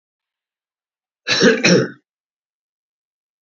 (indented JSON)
{
  "cough_length": "3.4 s",
  "cough_amplitude": 30200,
  "cough_signal_mean_std_ratio": 0.32,
  "survey_phase": "beta (2021-08-13 to 2022-03-07)",
  "age": "65+",
  "gender": "Male",
  "wearing_mask": "No",
  "symptom_none": true,
  "smoker_status": "Never smoked",
  "respiratory_condition_asthma": false,
  "respiratory_condition_other": false,
  "recruitment_source": "REACT",
  "submission_delay": "1 day",
  "covid_test_result": "Negative",
  "covid_test_method": "RT-qPCR",
  "influenza_a_test_result": "Negative",
  "influenza_b_test_result": "Negative"
}